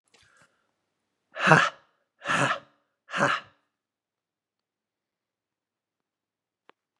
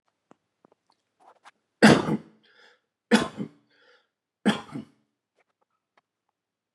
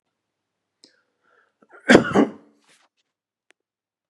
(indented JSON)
{
  "exhalation_length": "7.0 s",
  "exhalation_amplitude": 31380,
  "exhalation_signal_mean_std_ratio": 0.25,
  "three_cough_length": "6.7 s",
  "three_cough_amplitude": 25118,
  "three_cough_signal_mean_std_ratio": 0.22,
  "cough_length": "4.1 s",
  "cough_amplitude": 32768,
  "cough_signal_mean_std_ratio": 0.2,
  "survey_phase": "beta (2021-08-13 to 2022-03-07)",
  "age": "45-64",
  "gender": "Male",
  "wearing_mask": "No",
  "symptom_none": true,
  "smoker_status": "Ex-smoker",
  "respiratory_condition_asthma": false,
  "respiratory_condition_other": false,
  "recruitment_source": "REACT",
  "submission_delay": "3 days",
  "covid_test_result": "Negative",
  "covid_test_method": "RT-qPCR",
  "influenza_a_test_result": "Negative",
  "influenza_b_test_result": "Negative"
}